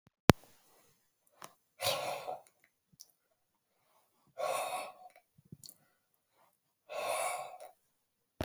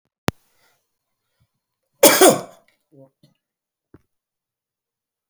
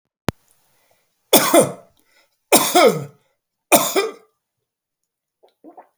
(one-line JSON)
{"exhalation_length": "8.4 s", "exhalation_amplitude": 26525, "exhalation_signal_mean_std_ratio": 0.26, "cough_length": "5.3 s", "cough_amplitude": 32768, "cough_signal_mean_std_ratio": 0.2, "three_cough_length": "6.0 s", "three_cough_amplitude": 32768, "three_cough_signal_mean_std_ratio": 0.33, "survey_phase": "beta (2021-08-13 to 2022-03-07)", "age": "65+", "gender": "Male", "wearing_mask": "No", "symptom_none": true, "smoker_status": "Ex-smoker", "respiratory_condition_asthma": false, "respiratory_condition_other": false, "recruitment_source": "REACT", "submission_delay": "2 days", "covid_test_result": "Negative", "covid_test_method": "RT-qPCR"}